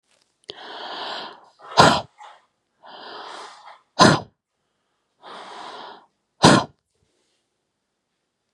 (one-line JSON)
{"exhalation_length": "8.5 s", "exhalation_amplitude": 32768, "exhalation_signal_mean_std_ratio": 0.26, "survey_phase": "beta (2021-08-13 to 2022-03-07)", "age": "45-64", "gender": "Female", "wearing_mask": "No", "symptom_cough_any": true, "symptom_runny_or_blocked_nose": true, "symptom_headache": true, "smoker_status": "Ex-smoker", "respiratory_condition_asthma": false, "respiratory_condition_other": false, "recruitment_source": "REACT", "submission_delay": "1 day", "covid_test_result": "Negative", "covid_test_method": "RT-qPCR"}